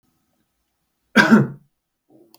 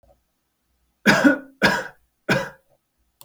{"cough_length": "2.4 s", "cough_amplitude": 32768, "cough_signal_mean_std_ratio": 0.28, "three_cough_length": "3.2 s", "three_cough_amplitude": 28781, "three_cough_signal_mean_std_ratio": 0.36, "survey_phase": "beta (2021-08-13 to 2022-03-07)", "age": "18-44", "gender": "Male", "wearing_mask": "No", "symptom_none": true, "smoker_status": "Never smoked", "respiratory_condition_asthma": false, "respiratory_condition_other": false, "recruitment_source": "REACT", "submission_delay": "3 days", "covid_test_result": "Negative", "covid_test_method": "RT-qPCR"}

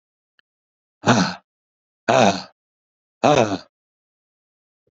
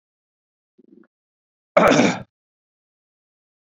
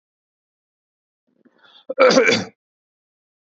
{"exhalation_length": "4.9 s", "exhalation_amplitude": 28211, "exhalation_signal_mean_std_ratio": 0.32, "three_cough_length": "3.7 s", "three_cough_amplitude": 28478, "three_cough_signal_mean_std_ratio": 0.26, "cough_length": "3.6 s", "cough_amplitude": 32767, "cough_signal_mean_std_ratio": 0.28, "survey_phase": "beta (2021-08-13 to 2022-03-07)", "age": "45-64", "gender": "Male", "wearing_mask": "No", "symptom_runny_or_blocked_nose": true, "symptom_sore_throat": true, "symptom_fatigue": true, "symptom_headache": true, "smoker_status": "Never smoked", "respiratory_condition_asthma": false, "respiratory_condition_other": false, "recruitment_source": "Test and Trace", "submission_delay": "2 days", "covid_test_result": "Positive", "covid_test_method": "LFT"}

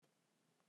{"cough_length": "0.7 s", "cough_amplitude": 31, "cough_signal_mean_std_ratio": 0.97, "survey_phase": "beta (2021-08-13 to 2022-03-07)", "age": "45-64", "gender": "Male", "wearing_mask": "No", "symptom_cough_any": true, "symptom_runny_or_blocked_nose": true, "symptom_headache": true, "symptom_change_to_sense_of_smell_or_taste": true, "symptom_loss_of_taste": true, "smoker_status": "Ex-smoker", "respiratory_condition_asthma": false, "respiratory_condition_other": false, "recruitment_source": "Test and Trace", "submission_delay": "1 day", "covid_test_result": "Positive", "covid_test_method": "RT-qPCR", "covid_ct_value": 21.9, "covid_ct_gene": "ORF1ab gene", "covid_ct_mean": 22.6, "covid_viral_load": "40000 copies/ml", "covid_viral_load_category": "Low viral load (10K-1M copies/ml)"}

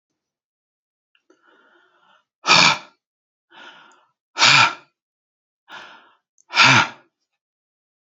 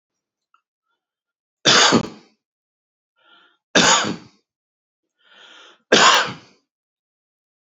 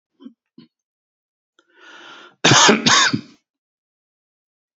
{"exhalation_length": "8.1 s", "exhalation_amplitude": 31816, "exhalation_signal_mean_std_ratio": 0.28, "three_cough_length": "7.7 s", "three_cough_amplitude": 30322, "three_cough_signal_mean_std_ratio": 0.31, "cough_length": "4.8 s", "cough_amplitude": 31657, "cough_signal_mean_std_ratio": 0.31, "survey_phase": "alpha (2021-03-01 to 2021-08-12)", "age": "65+", "gender": "Male", "wearing_mask": "No", "symptom_none": true, "smoker_status": "Never smoked", "respiratory_condition_asthma": false, "respiratory_condition_other": false, "recruitment_source": "REACT", "submission_delay": "1 day", "covid_test_result": "Negative", "covid_test_method": "RT-qPCR"}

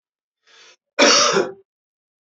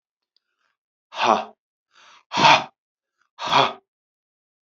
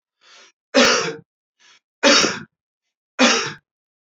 {"cough_length": "2.3 s", "cough_amplitude": 27774, "cough_signal_mean_std_ratio": 0.38, "exhalation_length": "4.7 s", "exhalation_amplitude": 28619, "exhalation_signal_mean_std_ratio": 0.31, "three_cough_length": "4.0 s", "three_cough_amplitude": 31009, "three_cough_signal_mean_std_ratio": 0.39, "survey_phase": "beta (2021-08-13 to 2022-03-07)", "age": "45-64", "gender": "Male", "wearing_mask": "No", "symptom_cough_any": true, "symptom_fatigue": true, "symptom_onset": "11 days", "smoker_status": "Never smoked", "respiratory_condition_asthma": true, "respiratory_condition_other": true, "recruitment_source": "REACT", "submission_delay": "3 days", "covid_test_result": "Negative", "covid_test_method": "RT-qPCR", "influenza_a_test_result": "Negative", "influenza_b_test_result": "Negative"}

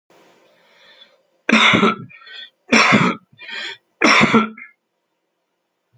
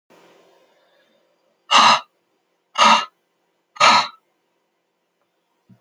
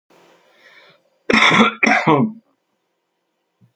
{"three_cough_length": "6.0 s", "three_cough_amplitude": 28610, "three_cough_signal_mean_std_ratio": 0.42, "exhalation_length": "5.8 s", "exhalation_amplitude": 31594, "exhalation_signal_mean_std_ratio": 0.3, "cough_length": "3.8 s", "cough_amplitude": 28667, "cough_signal_mean_std_ratio": 0.4, "survey_phase": "alpha (2021-03-01 to 2021-08-12)", "age": "65+", "gender": "Male", "wearing_mask": "No", "symptom_cough_any": true, "smoker_status": "Never smoked", "respiratory_condition_asthma": false, "respiratory_condition_other": false, "recruitment_source": "REACT", "submission_delay": "2 days", "covid_test_result": "Negative", "covid_test_method": "RT-qPCR"}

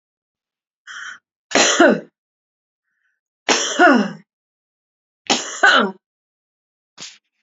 {"three_cough_length": "7.4 s", "three_cough_amplitude": 32768, "three_cough_signal_mean_std_ratio": 0.35, "survey_phase": "beta (2021-08-13 to 2022-03-07)", "age": "18-44", "gender": "Female", "wearing_mask": "No", "symptom_cough_any": true, "symptom_fatigue": true, "symptom_headache": true, "symptom_other": true, "smoker_status": "Never smoked", "respiratory_condition_asthma": false, "respiratory_condition_other": false, "recruitment_source": "Test and Trace", "submission_delay": "2 days", "covid_test_result": "Positive", "covid_test_method": "RT-qPCR", "covid_ct_value": 33.7, "covid_ct_gene": "ORF1ab gene", "covid_ct_mean": 34.6, "covid_viral_load": "4.5 copies/ml", "covid_viral_load_category": "Minimal viral load (< 10K copies/ml)"}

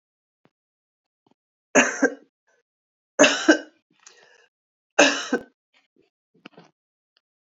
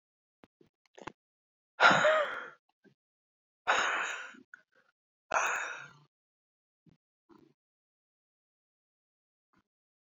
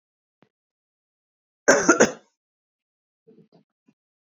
{"three_cough_length": "7.4 s", "three_cough_amplitude": 27748, "three_cough_signal_mean_std_ratio": 0.25, "exhalation_length": "10.2 s", "exhalation_amplitude": 12747, "exhalation_signal_mean_std_ratio": 0.28, "cough_length": "4.3 s", "cough_amplitude": 27083, "cough_signal_mean_std_ratio": 0.22, "survey_phase": "alpha (2021-03-01 to 2021-08-12)", "age": "65+", "gender": "Female", "wearing_mask": "No", "symptom_new_continuous_cough": true, "symptom_change_to_sense_of_smell_or_taste": true, "symptom_loss_of_taste": true, "symptom_onset": "6 days", "smoker_status": "Never smoked", "respiratory_condition_asthma": false, "respiratory_condition_other": false, "recruitment_source": "Test and Trace", "submission_delay": "1 day", "covid_test_result": "Positive", "covid_test_method": "RT-qPCR", "covid_ct_value": 14.8, "covid_ct_gene": "ORF1ab gene", "covid_ct_mean": 15.9, "covid_viral_load": "6300000 copies/ml", "covid_viral_load_category": "High viral load (>1M copies/ml)"}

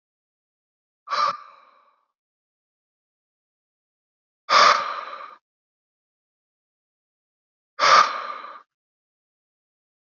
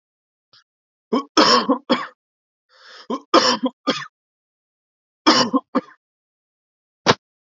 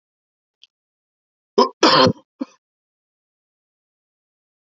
{"exhalation_length": "10.1 s", "exhalation_amplitude": 25091, "exhalation_signal_mean_std_ratio": 0.25, "three_cough_length": "7.4 s", "three_cough_amplitude": 29778, "three_cough_signal_mean_std_ratio": 0.34, "cough_length": "4.7 s", "cough_amplitude": 29123, "cough_signal_mean_std_ratio": 0.23, "survey_phase": "beta (2021-08-13 to 2022-03-07)", "age": "18-44", "gender": "Male", "wearing_mask": "No", "symptom_none": true, "smoker_status": "Never smoked", "respiratory_condition_asthma": false, "respiratory_condition_other": false, "recruitment_source": "Test and Trace", "submission_delay": "2 days", "covid_test_result": "Negative", "covid_test_method": "RT-qPCR"}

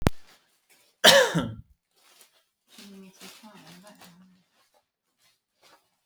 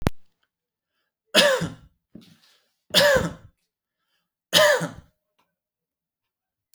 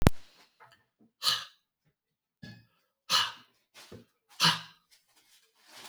{"cough_length": "6.1 s", "cough_amplitude": 32768, "cough_signal_mean_std_ratio": 0.24, "three_cough_length": "6.7 s", "three_cough_amplitude": 27101, "three_cough_signal_mean_std_ratio": 0.33, "exhalation_length": "5.9 s", "exhalation_amplitude": 25555, "exhalation_signal_mean_std_ratio": 0.28, "survey_phase": "alpha (2021-03-01 to 2021-08-12)", "age": "45-64", "gender": "Male", "wearing_mask": "No", "symptom_none": true, "smoker_status": "Never smoked", "respiratory_condition_asthma": false, "respiratory_condition_other": false, "recruitment_source": "REACT", "submission_delay": "1 day", "covid_test_result": "Negative", "covid_test_method": "RT-qPCR"}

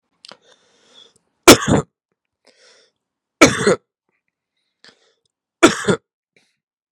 {"three_cough_length": "6.9 s", "three_cough_amplitude": 32768, "three_cough_signal_mean_std_ratio": 0.24, "survey_phase": "beta (2021-08-13 to 2022-03-07)", "age": "18-44", "gender": "Male", "wearing_mask": "No", "symptom_cough_any": true, "symptom_runny_or_blocked_nose": true, "symptom_sore_throat": true, "symptom_diarrhoea": true, "symptom_headache": true, "symptom_onset": "3 days", "smoker_status": "Ex-smoker", "respiratory_condition_asthma": false, "respiratory_condition_other": false, "recruitment_source": "Test and Trace", "submission_delay": "1 day", "covid_test_result": "Positive", "covid_test_method": "RT-qPCR", "covid_ct_value": 18.5, "covid_ct_gene": "N gene"}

